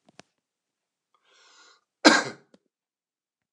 {"cough_length": "3.5 s", "cough_amplitude": 28968, "cough_signal_mean_std_ratio": 0.17, "survey_phase": "beta (2021-08-13 to 2022-03-07)", "age": "45-64", "gender": "Male", "wearing_mask": "No", "symptom_none": true, "smoker_status": "Ex-smoker", "respiratory_condition_asthma": false, "respiratory_condition_other": false, "recruitment_source": "REACT", "submission_delay": "1 day", "covid_test_result": "Negative", "covid_test_method": "RT-qPCR", "influenza_a_test_result": "Negative", "influenza_b_test_result": "Negative"}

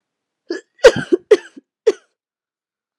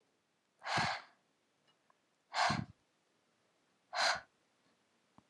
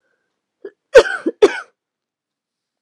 {"three_cough_length": "3.0 s", "three_cough_amplitude": 32768, "three_cough_signal_mean_std_ratio": 0.24, "exhalation_length": "5.3 s", "exhalation_amplitude": 2931, "exhalation_signal_mean_std_ratio": 0.33, "cough_length": "2.8 s", "cough_amplitude": 32768, "cough_signal_mean_std_ratio": 0.24, "survey_phase": "beta (2021-08-13 to 2022-03-07)", "age": "18-44", "gender": "Female", "wearing_mask": "No", "symptom_headache": true, "symptom_onset": "12 days", "smoker_status": "Never smoked", "respiratory_condition_asthma": true, "respiratory_condition_other": false, "recruitment_source": "REACT", "submission_delay": "1 day", "covid_test_result": "Negative", "covid_test_method": "RT-qPCR", "influenza_a_test_result": "Negative", "influenza_b_test_result": "Negative"}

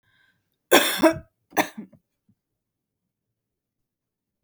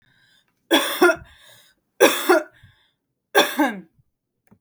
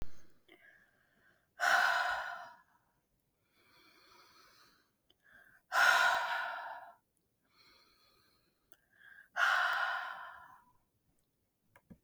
{"cough_length": "4.4 s", "cough_amplitude": 32768, "cough_signal_mean_std_ratio": 0.24, "three_cough_length": "4.6 s", "three_cough_amplitude": 32768, "three_cough_signal_mean_std_ratio": 0.37, "exhalation_length": "12.0 s", "exhalation_amplitude": 5353, "exhalation_signal_mean_std_ratio": 0.39, "survey_phase": "beta (2021-08-13 to 2022-03-07)", "age": "18-44", "gender": "Female", "wearing_mask": "No", "symptom_none": true, "smoker_status": "Never smoked", "respiratory_condition_asthma": false, "respiratory_condition_other": false, "recruitment_source": "REACT", "submission_delay": "0 days", "covid_test_result": "Negative", "covid_test_method": "RT-qPCR", "influenza_a_test_result": "Negative", "influenza_b_test_result": "Negative"}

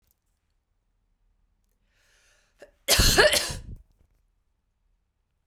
{"cough_length": "5.5 s", "cough_amplitude": 19820, "cough_signal_mean_std_ratio": 0.27, "survey_phase": "beta (2021-08-13 to 2022-03-07)", "age": "18-44", "gender": "Female", "wearing_mask": "No", "symptom_cough_any": true, "symptom_runny_or_blocked_nose": true, "symptom_shortness_of_breath": true, "symptom_fatigue": true, "symptom_headache": true, "symptom_change_to_sense_of_smell_or_taste": true, "symptom_onset": "3 days", "smoker_status": "Never smoked", "respiratory_condition_asthma": false, "respiratory_condition_other": false, "recruitment_source": "Test and Trace", "submission_delay": "2 days", "covid_test_result": "Positive", "covid_test_method": "RT-qPCR"}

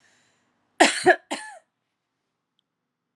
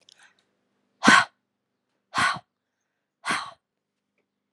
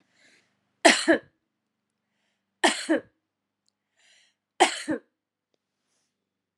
{"cough_length": "3.2 s", "cough_amplitude": 27495, "cough_signal_mean_std_ratio": 0.24, "exhalation_length": "4.5 s", "exhalation_amplitude": 28903, "exhalation_signal_mean_std_ratio": 0.25, "three_cough_length": "6.6 s", "three_cough_amplitude": 27199, "three_cough_signal_mean_std_ratio": 0.25, "survey_phase": "alpha (2021-03-01 to 2021-08-12)", "age": "45-64", "gender": "Female", "wearing_mask": "No", "symptom_cough_any": true, "symptom_fatigue": true, "symptom_headache": true, "symptom_change_to_sense_of_smell_or_taste": true, "symptom_loss_of_taste": true, "symptom_onset": "2 days", "smoker_status": "Never smoked", "respiratory_condition_asthma": false, "respiratory_condition_other": false, "recruitment_source": "Test and Trace", "submission_delay": "1 day", "covid_test_result": "Positive", "covid_test_method": "RT-qPCR", "covid_ct_value": 14.5, "covid_ct_gene": "ORF1ab gene", "covid_ct_mean": 14.8, "covid_viral_load": "14000000 copies/ml", "covid_viral_load_category": "High viral load (>1M copies/ml)"}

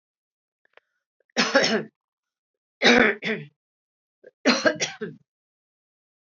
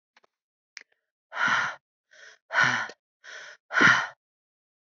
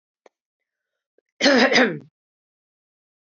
{"three_cough_length": "6.3 s", "three_cough_amplitude": 24656, "three_cough_signal_mean_std_ratio": 0.33, "exhalation_length": "4.9 s", "exhalation_amplitude": 19634, "exhalation_signal_mean_std_ratio": 0.36, "cough_length": "3.2 s", "cough_amplitude": 22125, "cough_signal_mean_std_ratio": 0.32, "survey_phase": "beta (2021-08-13 to 2022-03-07)", "age": "65+", "gender": "Female", "wearing_mask": "No", "symptom_none": true, "smoker_status": "Never smoked", "respiratory_condition_asthma": false, "respiratory_condition_other": false, "recruitment_source": "REACT", "submission_delay": "2 days", "covid_test_result": "Negative", "covid_test_method": "RT-qPCR", "influenza_a_test_result": "Negative", "influenza_b_test_result": "Negative"}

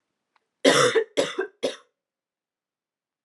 {"three_cough_length": "3.2 s", "three_cough_amplitude": 26208, "three_cough_signal_mean_std_ratio": 0.35, "survey_phase": "alpha (2021-03-01 to 2021-08-12)", "age": "18-44", "gender": "Female", "wearing_mask": "No", "symptom_cough_any": true, "symptom_new_continuous_cough": true, "symptom_fatigue": true, "symptom_headache": true, "symptom_onset": "6 days", "smoker_status": "Never smoked", "respiratory_condition_asthma": false, "respiratory_condition_other": false, "recruitment_source": "Test and Trace", "submission_delay": "2 days", "covid_test_result": "Positive", "covid_test_method": "RT-qPCR", "covid_ct_value": 17.3, "covid_ct_gene": "ORF1ab gene", "covid_ct_mean": 18.3, "covid_viral_load": "1000000 copies/ml", "covid_viral_load_category": "High viral load (>1M copies/ml)"}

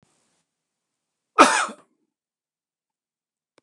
{"cough_length": "3.6 s", "cough_amplitude": 29204, "cough_signal_mean_std_ratio": 0.19, "survey_phase": "beta (2021-08-13 to 2022-03-07)", "age": "65+", "gender": "Male", "wearing_mask": "No", "symptom_none": true, "smoker_status": "Ex-smoker", "respiratory_condition_asthma": false, "respiratory_condition_other": false, "recruitment_source": "REACT", "submission_delay": "1 day", "covid_test_result": "Negative", "covid_test_method": "RT-qPCR", "influenza_a_test_result": "Negative", "influenza_b_test_result": "Negative"}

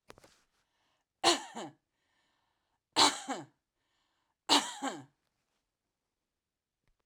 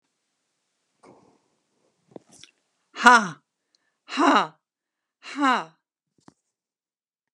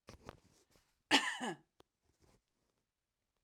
{"three_cough_length": "7.1 s", "three_cough_amplitude": 12944, "three_cough_signal_mean_std_ratio": 0.25, "exhalation_length": "7.3 s", "exhalation_amplitude": 32767, "exhalation_signal_mean_std_ratio": 0.23, "cough_length": "3.4 s", "cough_amplitude": 7065, "cough_signal_mean_std_ratio": 0.24, "survey_phase": "alpha (2021-03-01 to 2021-08-12)", "age": "65+", "gender": "Female", "wearing_mask": "No", "symptom_none": true, "smoker_status": "Ex-smoker", "respiratory_condition_asthma": false, "respiratory_condition_other": false, "recruitment_source": "REACT", "submission_delay": "2 days", "covid_test_result": "Negative", "covid_test_method": "RT-qPCR"}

